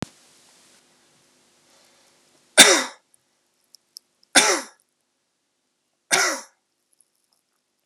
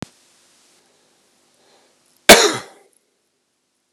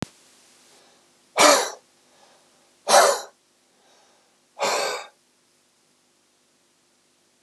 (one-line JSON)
{"three_cough_length": "7.9 s", "three_cough_amplitude": 32768, "three_cough_signal_mean_std_ratio": 0.22, "cough_length": "3.9 s", "cough_amplitude": 32768, "cough_signal_mean_std_ratio": 0.19, "exhalation_length": "7.4 s", "exhalation_amplitude": 29755, "exhalation_signal_mean_std_ratio": 0.28, "survey_phase": "beta (2021-08-13 to 2022-03-07)", "age": "18-44", "gender": "Male", "wearing_mask": "No", "symptom_cough_any": true, "symptom_runny_or_blocked_nose": true, "symptom_onset": "2 days", "smoker_status": "Never smoked", "respiratory_condition_asthma": false, "respiratory_condition_other": false, "recruitment_source": "Test and Trace", "submission_delay": "1 day", "covid_test_result": "Positive", "covid_test_method": "RT-qPCR", "covid_ct_value": 30.6, "covid_ct_gene": "N gene"}